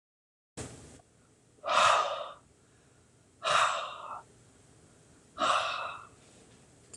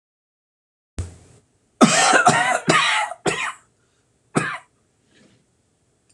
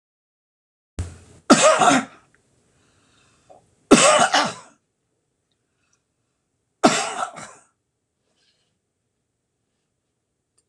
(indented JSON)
{
  "exhalation_length": "7.0 s",
  "exhalation_amplitude": 9285,
  "exhalation_signal_mean_std_ratio": 0.41,
  "cough_length": "6.1 s",
  "cough_amplitude": 26028,
  "cough_signal_mean_std_ratio": 0.41,
  "three_cough_length": "10.7 s",
  "three_cough_amplitude": 26028,
  "three_cough_signal_mean_std_ratio": 0.28,
  "survey_phase": "beta (2021-08-13 to 2022-03-07)",
  "age": "65+",
  "gender": "Male",
  "wearing_mask": "No",
  "symptom_none": true,
  "smoker_status": "Never smoked",
  "respiratory_condition_asthma": false,
  "respiratory_condition_other": false,
  "recruitment_source": "REACT",
  "submission_delay": "1 day",
  "covid_test_result": "Negative",
  "covid_test_method": "RT-qPCR"
}